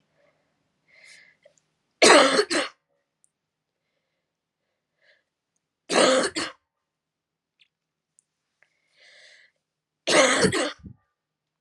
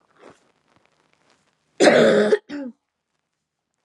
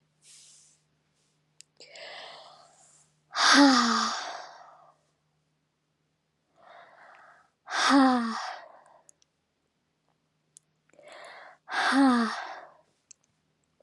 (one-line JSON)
{"three_cough_length": "11.6 s", "three_cough_amplitude": 29593, "three_cough_signal_mean_std_ratio": 0.29, "cough_length": "3.8 s", "cough_amplitude": 29326, "cough_signal_mean_std_ratio": 0.34, "exhalation_length": "13.8 s", "exhalation_amplitude": 15183, "exhalation_signal_mean_std_ratio": 0.33, "survey_phase": "alpha (2021-03-01 to 2021-08-12)", "age": "18-44", "gender": "Female", "wearing_mask": "No", "symptom_cough_any": true, "symptom_fatigue": true, "symptom_headache": true, "smoker_status": "Ex-smoker", "respiratory_condition_asthma": false, "respiratory_condition_other": false, "recruitment_source": "Test and Trace", "submission_delay": "1 day", "covid_test_result": "Positive", "covid_test_method": "LFT"}